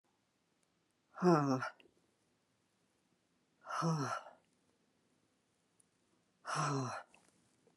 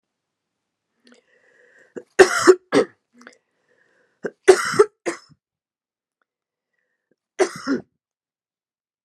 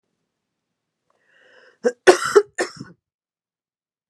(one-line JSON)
{"exhalation_length": "7.8 s", "exhalation_amplitude": 5219, "exhalation_signal_mean_std_ratio": 0.33, "three_cough_length": "9.0 s", "three_cough_amplitude": 32768, "three_cough_signal_mean_std_ratio": 0.23, "cough_length": "4.1 s", "cough_amplitude": 32768, "cough_signal_mean_std_ratio": 0.22, "survey_phase": "beta (2021-08-13 to 2022-03-07)", "age": "45-64", "gender": "Female", "wearing_mask": "No", "symptom_cough_any": true, "symptom_runny_or_blocked_nose": true, "symptom_fever_high_temperature": true, "symptom_onset": "2 days", "smoker_status": "Never smoked", "respiratory_condition_asthma": false, "respiratory_condition_other": false, "recruitment_source": "Test and Trace", "submission_delay": "1 day", "covid_test_result": "Positive", "covid_test_method": "RT-qPCR"}